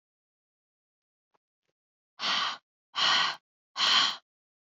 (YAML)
exhalation_length: 4.8 s
exhalation_amplitude: 8994
exhalation_signal_mean_std_ratio: 0.38
survey_phase: beta (2021-08-13 to 2022-03-07)
age: 18-44
gender: Female
wearing_mask: 'No'
symptom_none: true
smoker_status: Never smoked
respiratory_condition_asthma: false
respiratory_condition_other: false
recruitment_source: REACT
submission_delay: 3 days
covid_test_result: Negative
covid_test_method: RT-qPCR
influenza_a_test_result: Unknown/Void
influenza_b_test_result: Unknown/Void